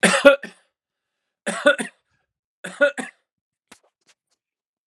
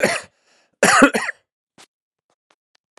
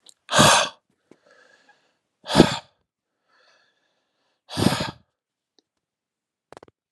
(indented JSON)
{
  "three_cough_length": "4.9 s",
  "three_cough_amplitude": 32767,
  "three_cough_signal_mean_std_ratio": 0.28,
  "cough_length": "3.0 s",
  "cough_amplitude": 32767,
  "cough_signal_mean_std_ratio": 0.33,
  "exhalation_length": "6.9 s",
  "exhalation_amplitude": 32768,
  "exhalation_signal_mean_std_ratio": 0.26,
  "survey_phase": "alpha (2021-03-01 to 2021-08-12)",
  "age": "18-44",
  "gender": "Male",
  "wearing_mask": "No",
  "symptom_cough_any": true,
  "symptom_change_to_sense_of_smell_or_taste": true,
  "symptom_loss_of_taste": true,
  "symptom_onset": "3 days",
  "smoker_status": "Current smoker (1 to 10 cigarettes per day)",
  "respiratory_condition_asthma": false,
  "respiratory_condition_other": false,
  "recruitment_source": "Test and Trace",
  "submission_delay": "2 days",
  "covid_test_result": "Positive",
  "covid_test_method": "RT-qPCR",
  "covid_ct_value": 15.8,
  "covid_ct_gene": "ORF1ab gene",
  "covid_ct_mean": 15.9,
  "covid_viral_load": "6100000 copies/ml",
  "covid_viral_load_category": "High viral load (>1M copies/ml)"
}